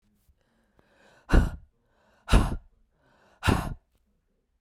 {"exhalation_length": "4.6 s", "exhalation_amplitude": 16061, "exhalation_signal_mean_std_ratio": 0.28, "survey_phase": "beta (2021-08-13 to 2022-03-07)", "age": "65+", "gender": "Female", "wearing_mask": "No", "symptom_cough_any": true, "symptom_runny_or_blocked_nose": true, "symptom_fatigue": true, "symptom_onset": "3 days", "smoker_status": "Ex-smoker", "respiratory_condition_asthma": false, "respiratory_condition_other": false, "recruitment_source": "Test and Trace", "submission_delay": "2 days", "covid_test_result": "Positive", "covid_test_method": "RT-qPCR", "covid_ct_value": 20.0, "covid_ct_gene": "ORF1ab gene", "covid_ct_mean": 20.2, "covid_viral_load": "230000 copies/ml", "covid_viral_load_category": "Low viral load (10K-1M copies/ml)"}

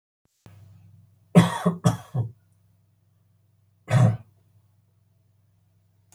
{"cough_length": "6.1 s", "cough_amplitude": 25331, "cough_signal_mean_std_ratio": 0.28, "survey_phase": "alpha (2021-03-01 to 2021-08-12)", "age": "65+", "gender": "Male", "wearing_mask": "No", "symptom_none": true, "smoker_status": "Never smoked", "respiratory_condition_asthma": false, "respiratory_condition_other": false, "recruitment_source": "REACT", "submission_delay": "1 day", "covid_test_result": "Negative", "covid_test_method": "RT-qPCR"}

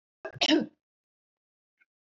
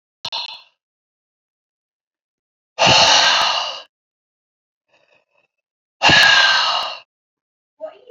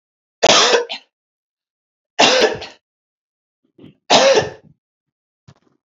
{"cough_length": "2.1 s", "cough_amplitude": 8105, "cough_signal_mean_std_ratio": 0.27, "exhalation_length": "8.1 s", "exhalation_amplitude": 32767, "exhalation_signal_mean_std_ratio": 0.4, "three_cough_length": "6.0 s", "three_cough_amplitude": 31777, "three_cough_signal_mean_std_ratio": 0.36, "survey_phase": "beta (2021-08-13 to 2022-03-07)", "age": "18-44", "gender": "Female", "wearing_mask": "No", "symptom_cough_any": true, "symptom_runny_or_blocked_nose": true, "symptom_shortness_of_breath": true, "symptom_abdominal_pain": true, "symptom_fatigue": true, "symptom_loss_of_taste": true, "symptom_onset": "4 days", "smoker_status": "Never smoked", "respiratory_condition_asthma": true, "respiratory_condition_other": false, "recruitment_source": "Test and Trace", "submission_delay": "2 days", "covid_test_result": "Positive", "covid_test_method": "RT-qPCR", "covid_ct_value": 15.8, "covid_ct_gene": "N gene", "covid_ct_mean": 16.8, "covid_viral_load": "3000000 copies/ml", "covid_viral_load_category": "High viral load (>1M copies/ml)"}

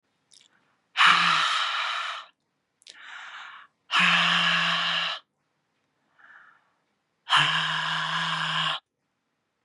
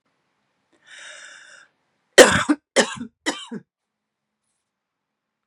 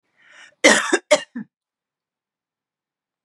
{"exhalation_length": "9.6 s", "exhalation_amplitude": 23186, "exhalation_signal_mean_std_ratio": 0.54, "three_cough_length": "5.5 s", "three_cough_amplitude": 32768, "three_cough_signal_mean_std_ratio": 0.22, "cough_length": "3.2 s", "cough_amplitude": 32767, "cough_signal_mean_std_ratio": 0.26, "survey_phase": "beta (2021-08-13 to 2022-03-07)", "age": "45-64", "gender": "Female", "wearing_mask": "No", "symptom_runny_or_blocked_nose": true, "symptom_headache": true, "symptom_other": true, "smoker_status": "Ex-smoker", "respiratory_condition_asthma": false, "respiratory_condition_other": false, "recruitment_source": "REACT", "submission_delay": "2 days", "covid_test_result": "Negative", "covid_test_method": "RT-qPCR", "influenza_a_test_result": "Negative", "influenza_b_test_result": "Negative"}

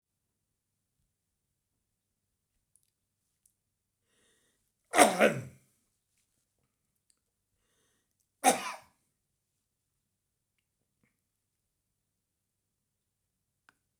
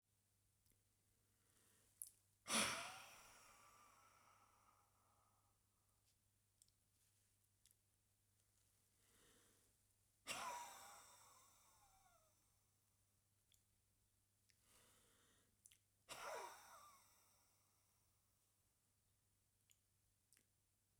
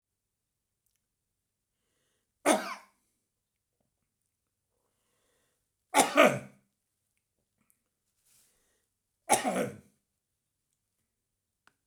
{"cough_length": "14.0 s", "cough_amplitude": 15640, "cough_signal_mean_std_ratio": 0.15, "exhalation_length": "21.0 s", "exhalation_amplitude": 1238, "exhalation_signal_mean_std_ratio": 0.27, "three_cough_length": "11.9 s", "three_cough_amplitude": 14422, "three_cough_signal_mean_std_ratio": 0.21, "survey_phase": "beta (2021-08-13 to 2022-03-07)", "age": "65+", "gender": "Male", "wearing_mask": "No", "symptom_none": true, "smoker_status": "Never smoked", "respiratory_condition_asthma": true, "respiratory_condition_other": false, "recruitment_source": "REACT", "submission_delay": "1 day", "covid_test_result": "Negative", "covid_test_method": "RT-qPCR"}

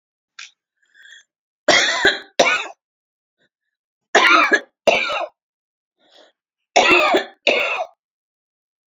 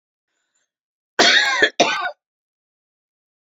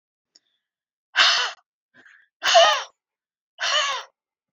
{"three_cough_length": "8.9 s", "three_cough_amplitude": 29175, "three_cough_signal_mean_std_ratio": 0.41, "cough_length": "3.5 s", "cough_amplitude": 28155, "cough_signal_mean_std_ratio": 0.36, "exhalation_length": "4.5 s", "exhalation_amplitude": 25003, "exhalation_signal_mean_std_ratio": 0.38, "survey_phase": "beta (2021-08-13 to 2022-03-07)", "age": "45-64", "gender": "Female", "wearing_mask": "No", "symptom_headache": true, "smoker_status": "Never smoked", "respiratory_condition_asthma": true, "respiratory_condition_other": false, "recruitment_source": "REACT", "submission_delay": "2 days", "covid_test_result": "Negative", "covid_test_method": "RT-qPCR"}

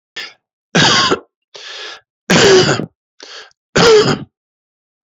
{"three_cough_length": "5.0 s", "three_cough_amplitude": 32767, "three_cough_signal_mean_std_ratio": 0.47, "survey_phase": "beta (2021-08-13 to 2022-03-07)", "age": "65+", "gender": "Male", "wearing_mask": "No", "symptom_none": true, "smoker_status": "Ex-smoker", "respiratory_condition_asthma": false, "respiratory_condition_other": false, "recruitment_source": "REACT", "submission_delay": "2 days", "covid_test_result": "Negative", "covid_test_method": "RT-qPCR", "influenza_a_test_result": "Unknown/Void", "influenza_b_test_result": "Unknown/Void"}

